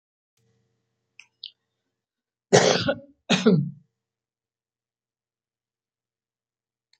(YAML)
cough_length: 7.0 s
cough_amplitude: 27061
cough_signal_mean_std_ratio: 0.25
survey_phase: beta (2021-08-13 to 2022-03-07)
age: 65+
gender: Female
wearing_mask: 'No'
symptom_none: true
smoker_status: Never smoked
respiratory_condition_asthma: false
respiratory_condition_other: false
recruitment_source: REACT
submission_delay: 2 days
covid_test_result: Negative
covid_test_method: RT-qPCR
influenza_a_test_result: Negative
influenza_b_test_result: Negative